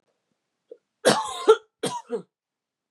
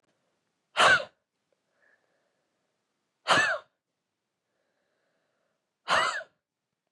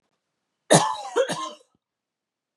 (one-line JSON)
{"cough_length": "2.9 s", "cough_amplitude": 24115, "cough_signal_mean_std_ratio": 0.3, "exhalation_length": "6.9 s", "exhalation_amplitude": 13262, "exhalation_signal_mean_std_ratio": 0.27, "three_cough_length": "2.6 s", "three_cough_amplitude": 29104, "three_cough_signal_mean_std_ratio": 0.33, "survey_phase": "beta (2021-08-13 to 2022-03-07)", "age": "18-44", "gender": "Female", "wearing_mask": "No", "symptom_cough_any": true, "symptom_runny_or_blocked_nose": true, "symptom_fatigue": true, "symptom_fever_high_temperature": true, "symptom_headache": true, "symptom_onset": "2 days", "smoker_status": "Never smoked", "respiratory_condition_asthma": false, "respiratory_condition_other": false, "recruitment_source": "Test and Trace", "submission_delay": "1 day", "covid_test_result": "Positive", "covid_test_method": "RT-qPCR", "covid_ct_value": 13.8, "covid_ct_gene": "N gene"}